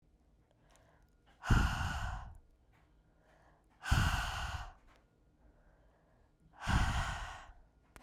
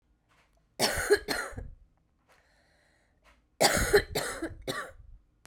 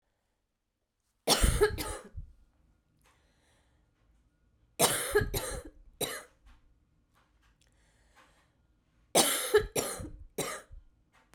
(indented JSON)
{
  "exhalation_length": "8.0 s",
  "exhalation_amplitude": 5304,
  "exhalation_signal_mean_std_ratio": 0.42,
  "cough_length": "5.5 s",
  "cough_amplitude": 12183,
  "cough_signal_mean_std_ratio": 0.39,
  "three_cough_length": "11.3 s",
  "three_cough_amplitude": 10430,
  "three_cough_signal_mean_std_ratio": 0.35,
  "survey_phase": "beta (2021-08-13 to 2022-03-07)",
  "age": "18-44",
  "gender": "Female",
  "wearing_mask": "No",
  "symptom_runny_or_blocked_nose": true,
  "symptom_headache": true,
  "symptom_loss_of_taste": true,
  "symptom_onset": "6 days",
  "smoker_status": "Current smoker (1 to 10 cigarettes per day)",
  "respiratory_condition_asthma": false,
  "respiratory_condition_other": false,
  "recruitment_source": "Test and Trace",
  "submission_delay": "1 day",
  "covid_test_result": "Positive",
  "covid_test_method": "RT-qPCR"
}